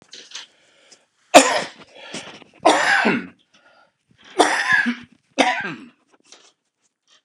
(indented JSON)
{
  "cough_length": "7.2 s",
  "cough_amplitude": 32768,
  "cough_signal_mean_std_ratio": 0.37,
  "survey_phase": "alpha (2021-03-01 to 2021-08-12)",
  "age": "65+",
  "gender": "Male",
  "wearing_mask": "No",
  "symptom_none": true,
  "smoker_status": "Ex-smoker",
  "respiratory_condition_asthma": false,
  "respiratory_condition_other": false,
  "recruitment_source": "REACT",
  "submission_delay": "3 days",
  "covid_test_result": "Negative",
  "covid_test_method": "RT-qPCR"
}